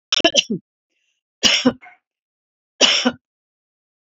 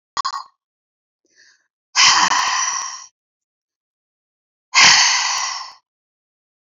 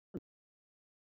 {"three_cough_length": "4.2 s", "three_cough_amplitude": 30287, "three_cough_signal_mean_std_ratio": 0.34, "exhalation_length": "6.7 s", "exhalation_amplitude": 32767, "exhalation_signal_mean_std_ratio": 0.41, "cough_length": "1.0 s", "cough_amplitude": 913, "cough_signal_mean_std_ratio": 0.15, "survey_phase": "beta (2021-08-13 to 2022-03-07)", "age": "45-64", "gender": "Female", "wearing_mask": "No", "symptom_none": true, "smoker_status": "Never smoked", "respiratory_condition_asthma": false, "respiratory_condition_other": false, "recruitment_source": "REACT", "submission_delay": "1 day", "covid_test_result": "Negative", "covid_test_method": "RT-qPCR"}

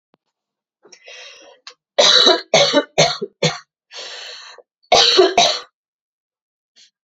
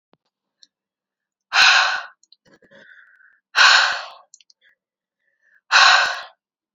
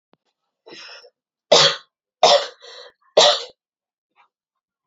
{"cough_length": "7.1 s", "cough_amplitude": 32768, "cough_signal_mean_std_ratio": 0.41, "exhalation_length": "6.7 s", "exhalation_amplitude": 30210, "exhalation_signal_mean_std_ratio": 0.35, "three_cough_length": "4.9 s", "three_cough_amplitude": 30853, "three_cough_signal_mean_std_ratio": 0.3, "survey_phase": "beta (2021-08-13 to 2022-03-07)", "age": "18-44", "gender": "Female", "wearing_mask": "No", "symptom_cough_any": true, "symptom_new_continuous_cough": true, "symptom_runny_or_blocked_nose": true, "symptom_sore_throat": true, "symptom_fatigue": true, "symptom_headache": true, "symptom_change_to_sense_of_smell_or_taste": true, "symptom_loss_of_taste": true, "symptom_onset": "6 days", "smoker_status": "Current smoker (e-cigarettes or vapes only)", "respiratory_condition_asthma": false, "respiratory_condition_other": false, "recruitment_source": "Test and Trace", "submission_delay": "2 days", "covid_test_result": "Positive", "covid_test_method": "RT-qPCR", "covid_ct_value": 17.1, "covid_ct_gene": "ORF1ab gene", "covid_ct_mean": 17.6, "covid_viral_load": "1700000 copies/ml", "covid_viral_load_category": "High viral load (>1M copies/ml)"}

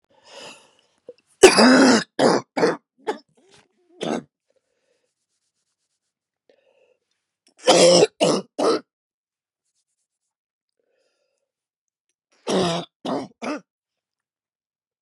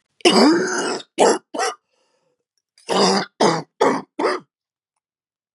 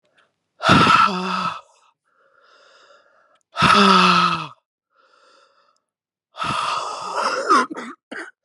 {"three_cough_length": "15.0 s", "three_cough_amplitude": 32768, "three_cough_signal_mean_std_ratio": 0.3, "cough_length": "5.5 s", "cough_amplitude": 32508, "cough_signal_mean_std_ratio": 0.48, "exhalation_length": "8.4 s", "exhalation_amplitude": 30325, "exhalation_signal_mean_std_ratio": 0.47, "survey_phase": "beta (2021-08-13 to 2022-03-07)", "age": "45-64", "gender": "Female", "wearing_mask": "No", "symptom_cough_any": true, "symptom_new_continuous_cough": true, "symptom_runny_or_blocked_nose": true, "symptom_shortness_of_breath": true, "symptom_diarrhoea": true, "symptom_fatigue": true, "symptom_headache": true, "symptom_change_to_sense_of_smell_or_taste": true, "symptom_loss_of_taste": true, "symptom_onset": "4 days", "smoker_status": "Ex-smoker", "respiratory_condition_asthma": false, "respiratory_condition_other": false, "recruitment_source": "Test and Trace", "submission_delay": "1 day", "covid_test_result": "Positive", "covid_test_method": "RT-qPCR", "covid_ct_value": 17.7, "covid_ct_gene": "ORF1ab gene", "covid_ct_mean": 18.1, "covid_viral_load": "1200000 copies/ml", "covid_viral_load_category": "High viral load (>1M copies/ml)"}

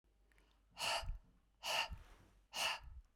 {"exhalation_length": "3.2 s", "exhalation_amplitude": 1705, "exhalation_signal_mean_std_ratio": 0.51, "survey_phase": "beta (2021-08-13 to 2022-03-07)", "age": "18-44", "gender": "Female", "wearing_mask": "No", "symptom_none": true, "smoker_status": "Never smoked", "respiratory_condition_asthma": false, "respiratory_condition_other": false, "recruitment_source": "REACT", "submission_delay": "2 days", "covid_test_result": "Negative", "covid_test_method": "RT-qPCR", "covid_ct_value": 40.0, "covid_ct_gene": "N gene"}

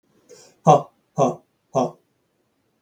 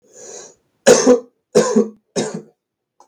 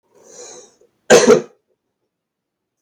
{"exhalation_length": "2.8 s", "exhalation_amplitude": 32359, "exhalation_signal_mean_std_ratio": 0.29, "three_cough_length": "3.1 s", "three_cough_amplitude": 32768, "three_cough_signal_mean_std_ratio": 0.4, "cough_length": "2.8 s", "cough_amplitude": 32768, "cough_signal_mean_std_ratio": 0.27, "survey_phase": "beta (2021-08-13 to 2022-03-07)", "age": "18-44", "gender": "Male", "wearing_mask": "No", "symptom_new_continuous_cough": true, "symptom_runny_or_blocked_nose": true, "symptom_fatigue": true, "symptom_onset": "4 days", "smoker_status": "Never smoked", "respiratory_condition_asthma": true, "respiratory_condition_other": false, "recruitment_source": "Test and Trace", "submission_delay": "2 days", "covid_test_result": "Positive", "covid_test_method": "RT-qPCR", "covid_ct_value": 18.3, "covid_ct_gene": "ORF1ab gene", "covid_ct_mean": 19.5, "covid_viral_load": "400000 copies/ml", "covid_viral_load_category": "Low viral load (10K-1M copies/ml)"}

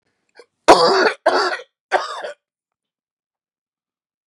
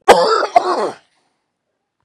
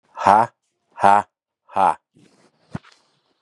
{"three_cough_length": "4.3 s", "three_cough_amplitude": 32768, "three_cough_signal_mean_std_ratio": 0.35, "cough_length": "2.0 s", "cough_amplitude": 32768, "cough_signal_mean_std_ratio": 0.44, "exhalation_length": "3.4 s", "exhalation_amplitude": 32768, "exhalation_signal_mean_std_ratio": 0.31, "survey_phase": "beta (2021-08-13 to 2022-03-07)", "age": "45-64", "gender": "Male", "wearing_mask": "No", "symptom_cough_any": true, "symptom_onset": "12 days", "smoker_status": "Ex-smoker", "respiratory_condition_asthma": false, "respiratory_condition_other": false, "recruitment_source": "REACT", "submission_delay": "5 days", "covid_test_result": "Negative", "covid_test_method": "RT-qPCR", "influenza_a_test_result": "Negative", "influenza_b_test_result": "Negative"}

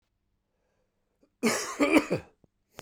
{"cough_length": "2.8 s", "cough_amplitude": 15926, "cough_signal_mean_std_ratio": 0.35, "survey_phase": "beta (2021-08-13 to 2022-03-07)", "age": "45-64", "gender": "Male", "wearing_mask": "No", "symptom_cough_any": true, "symptom_runny_or_blocked_nose": true, "symptom_fatigue": true, "symptom_headache": true, "symptom_onset": "3 days", "smoker_status": "Never smoked", "respiratory_condition_asthma": false, "respiratory_condition_other": false, "recruitment_source": "Test and Trace", "submission_delay": "1 day", "covid_test_result": "Positive", "covid_test_method": "RT-qPCR", "covid_ct_value": 15.6, "covid_ct_gene": "ORF1ab gene", "covid_ct_mean": 15.7, "covid_viral_load": "6800000 copies/ml", "covid_viral_load_category": "High viral load (>1M copies/ml)"}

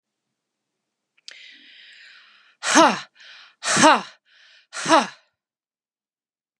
{"exhalation_length": "6.6 s", "exhalation_amplitude": 32292, "exhalation_signal_mean_std_ratio": 0.27, "survey_phase": "beta (2021-08-13 to 2022-03-07)", "age": "45-64", "gender": "Female", "wearing_mask": "No", "symptom_none": true, "smoker_status": "Never smoked", "respiratory_condition_asthma": false, "respiratory_condition_other": false, "recruitment_source": "REACT", "submission_delay": "1 day", "covid_test_result": "Negative", "covid_test_method": "RT-qPCR", "influenza_a_test_result": "Negative", "influenza_b_test_result": "Negative"}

